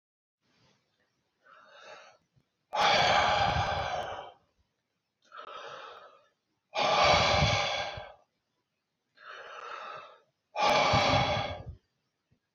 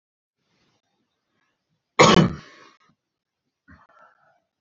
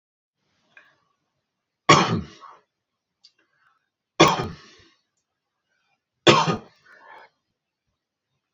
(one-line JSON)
{"exhalation_length": "12.5 s", "exhalation_amplitude": 10230, "exhalation_signal_mean_std_ratio": 0.48, "cough_length": "4.6 s", "cough_amplitude": 28566, "cough_signal_mean_std_ratio": 0.21, "three_cough_length": "8.5 s", "three_cough_amplitude": 28317, "three_cough_signal_mean_std_ratio": 0.23, "survey_phase": "beta (2021-08-13 to 2022-03-07)", "age": "18-44", "gender": "Male", "wearing_mask": "No", "symptom_none": true, "smoker_status": "Never smoked", "respiratory_condition_asthma": false, "respiratory_condition_other": false, "recruitment_source": "REACT", "submission_delay": "4 days", "covid_test_result": "Negative", "covid_test_method": "RT-qPCR", "influenza_a_test_result": "Negative", "influenza_b_test_result": "Negative"}